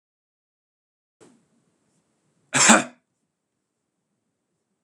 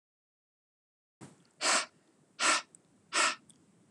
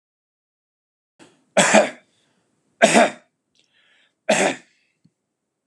{
  "cough_length": "4.8 s",
  "cough_amplitude": 32768,
  "cough_signal_mean_std_ratio": 0.19,
  "exhalation_length": "3.9 s",
  "exhalation_amplitude": 6645,
  "exhalation_signal_mean_std_ratio": 0.34,
  "three_cough_length": "5.7 s",
  "three_cough_amplitude": 32345,
  "three_cough_signal_mean_std_ratio": 0.3,
  "survey_phase": "beta (2021-08-13 to 2022-03-07)",
  "age": "18-44",
  "gender": "Male",
  "wearing_mask": "No",
  "symptom_none": true,
  "symptom_onset": "8 days",
  "smoker_status": "Ex-smoker",
  "respiratory_condition_asthma": false,
  "respiratory_condition_other": false,
  "recruitment_source": "REACT",
  "submission_delay": "3 days",
  "covid_test_result": "Negative",
  "covid_test_method": "RT-qPCR"
}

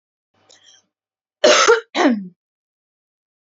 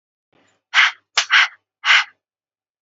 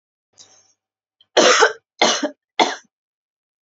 {
  "cough_length": "3.4 s",
  "cough_amplitude": 28313,
  "cough_signal_mean_std_ratio": 0.34,
  "exhalation_length": "2.8 s",
  "exhalation_amplitude": 28752,
  "exhalation_signal_mean_std_ratio": 0.36,
  "three_cough_length": "3.7 s",
  "three_cough_amplitude": 30362,
  "three_cough_signal_mean_std_ratio": 0.34,
  "survey_phase": "beta (2021-08-13 to 2022-03-07)",
  "age": "18-44",
  "gender": "Female",
  "wearing_mask": "No",
  "symptom_none": true,
  "smoker_status": "Ex-smoker",
  "respiratory_condition_asthma": false,
  "respiratory_condition_other": false,
  "recruitment_source": "REACT",
  "submission_delay": "2 days",
  "covid_test_result": "Negative",
  "covid_test_method": "RT-qPCR",
  "influenza_a_test_result": "Negative",
  "influenza_b_test_result": "Negative"
}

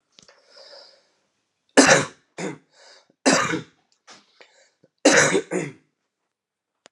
{
  "three_cough_length": "6.9 s",
  "three_cough_amplitude": 30901,
  "three_cough_signal_mean_std_ratio": 0.31,
  "survey_phase": "beta (2021-08-13 to 2022-03-07)",
  "age": "45-64",
  "gender": "Male",
  "wearing_mask": "No",
  "symptom_cough_any": true,
  "symptom_runny_or_blocked_nose": true,
  "symptom_fatigue": true,
  "symptom_onset": "2 days",
  "smoker_status": "Ex-smoker",
  "respiratory_condition_asthma": true,
  "respiratory_condition_other": false,
  "recruitment_source": "Test and Trace",
  "submission_delay": "1 day",
  "covid_test_result": "Positive",
  "covid_test_method": "RT-qPCR",
  "covid_ct_value": 19.0,
  "covid_ct_gene": "ORF1ab gene",
  "covid_ct_mean": 19.2,
  "covid_viral_load": "500000 copies/ml",
  "covid_viral_load_category": "Low viral load (10K-1M copies/ml)"
}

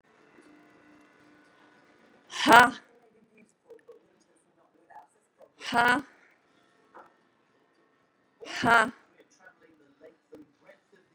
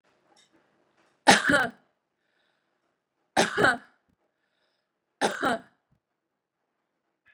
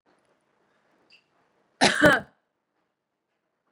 {
  "exhalation_length": "11.1 s",
  "exhalation_amplitude": 28668,
  "exhalation_signal_mean_std_ratio": 0.2,
  "three_cough_length": "7.3 s",
  "three_cough_amplitude": 26470,
  "three_cough_signal_mean_std_ratio": 0.27,
  "cough_length": "3.7 s",
  "cough_amplitude": 26318,
  "cough_signal_mean_std_ratio": 0.23,
  "survey_phase": "beta (2021-08-13 to 2022-03-07)",
  "age": "65+",
  "gender": "Female",
  "wearing_mask": "No",
  "symptom_cough_any": true,
  "symptom_sore_throat": true,
  "symptom_onset": "12 days",
  "smoker_status": "Never smoked",
  "respiratory_condition_asthma": false,
  "respiratory_condition_other": false,
  "recruitment_source": "REACT",
  "submission_delay": "3 days",
  "covid_test_result": "Negative",
  "covid_test_method": "RT-qPCR",
  "influenza_a_test_result": "Negative",
  "influenza_b_test_result": "Negative"
}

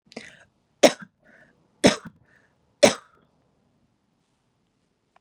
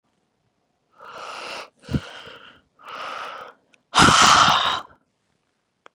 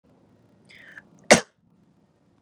{
  "three_cough_length": "5.2 s",
  "three_cough_amplitude": 31838,
  "three_cough_signal_mean_std_ratio": 0.17,
  "exhalation_length": "5.9 s",
  "exhalation_amplitude": 29572,
  "exhalation_signal_mean_std_ratio": 0.35,
  "cough_length": "2.4 s",
  "cough_amplitude": 32767,
  "cough_signal_mean_std_ratio": 0.15,
  "survey_phase": "beta (2021-08-13 to 2022-03-07)",
  "age": "45-64",
  "gender": "Female",
  "wearing_mask": "No",
  "symptom_cough_any": true,
  "symptom_sore_throat": true,
  "symptom_fatigue": true,
  "symptom_headache": true,
  "smoker_status": "Never smoked",
  "respiratory_condition_asthma": false,
  "respiratory_condition_other": false,
  "recruitment_source": "Test and Trace",
  "submission_delay": "0 days",
  "covid_test_result": "Positive",
  "covid_test_method": "LFT"
}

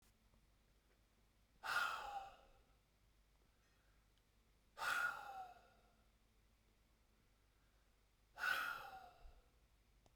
{
  "exhalation_length": "10.2 s",
  "exhalation_amplitude": 1172,
  "exhalation_signal_mean_std_ratio": 0.38,
  "survey_phase": "beta (2021-08-13 to 2022-03-07)",
  "age": "45-64",
  "gender": "Male",
  "wearing_mask": "No",
  "symptom_cough_any": true,
  "symptom_sore_throat": true,
  "symptom_fatigue": true,
  "symptom_headache": true,
  "symptom_onset": "4 days",
  "smoker_status": "Never smoked",
  "respiratory_condition_asthma": false,
  "respiratory_condition_other": false,
  "recruitment_source": "Test and Trace",
  "submission_delay": "2 days",
  "covid_test_result": "Positive",
  "covid_test_method": "RT-qPCR"
}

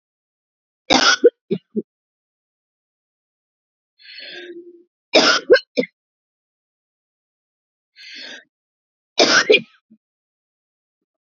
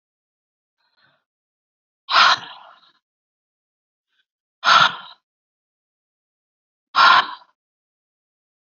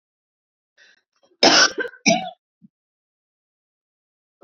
{
  "three_cough_length": "11.3 s",
  "three_cough_amplitude": 32114,
  "three_cough_signal_mean_std_ratio": 0.26,
  "exhalation_length": "8.8 s",
  "exhalation_amplitude": 29003,
  "exhalation_signal_mean_std_ratio": 0.25,
  "cough_length": "4.4 s",
  "cough_amplitude": 32768,
  "cough_signal_mean_std_ratio": 0.26,
  "survey_phase": "beta (2021-08-13 to 2022-03-07)",
  "age": "45-64",
  "gender": "Female",
  "wearing_mask": "No",
  "symptom_cough_any": true,
  "symptom_new_continuous_cough": true,
  "symptom_runny_or_blocked_nose": true,
  "symptom_shortness_of_breath": true,
  "symptom_sore_throat": true,
  "symptom_fatigue": true,
  "symptom_headache": true,
  "symptom_change_to_sense_of_smell_or_taste": true,
  "symptom_loss_of_taste": true,
  "smoker_status": "Never smoked",
  "respiratory_condition_asthma": false,
  "respiratory_condition_other": false,
  "recruitment_source": "Test and Trace",
  "submission_delay": "1 day",
  "covid_test_result": "Positive",
  "covid_test_method": "RT-qPCR",
  "covid_ct_value": 23.3,
  "covid_ct_gene": "N gene"
}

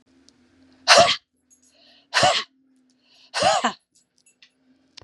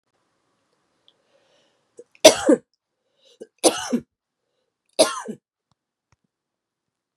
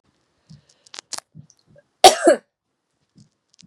{
  "exhalation_length": "5.0 s",
  "exhalation_amplitude": 31634,
  "exhalation_signal_mean_std_ratio": 0.32,
  "three_cough_length": "7.2 s",
  "three_cough_amplitude": 32768,
  "three_cough_signal_mean_std_ratio": 0.2,
  "cough_length": "3.7 s",
  "cough_amplitude": 32768,
  "cough_signal_mean_std_ratio": 0.19,
  "survey_phase": "beta (2021-08-13 to 2022-03-07)",
  "age": "45-64",
  "gender": "Female",
  "wearing_mask": "No",
  "symptom_cough_any": true,
  "symptom_runny_or_blocked_nose": true,
  "symptom_fatigue": true,
  "symptom_fever_high_temperature": true,
  "symptom_headache": true,
  "symptom_onset": "4 days",
  "smoker_status": "Ex-smoker",
  "respiratory_condition_asthma": false,
  "respiratory_condition_other": false,
  "recruitment_source": "Test and Trace",
  "submission_delay": "2 days",
  "covid_test_result": "Positive",
  "covid_test_method": "ePCR"
}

